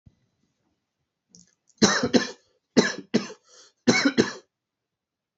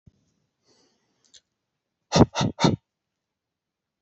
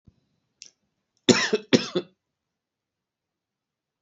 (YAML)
three_cough_length: 5.4 s
three_cough_amplitude: 25883
three_cough_signal_mean_std_ratio: 0.32
exhalation_length: 4.0 s
exhalation_amplitude: 25913
exhalation_signal_mean_std_ratio: 0.23
cough_length: 4.0 s
cough_amplitude: 27215
cough_signal_mean_std_ratio: 0.22
survey_phase: beta (2021-08-13 to 2022-03-07)
age: 18-44
gender: Male
wearing_mask: 'No'
symptom_none: true
smoker_status: Never smoked
respiratory_condition_asthma: false
respiratory_condition_other: false
recruitment_source: REACT
submission_delay: 2 days
covid_test_result: Negative
covid_test_method: RT-qPCR
influenza_a_test_result: Unknown/Void
influenza_b_test_result: Unknown/Void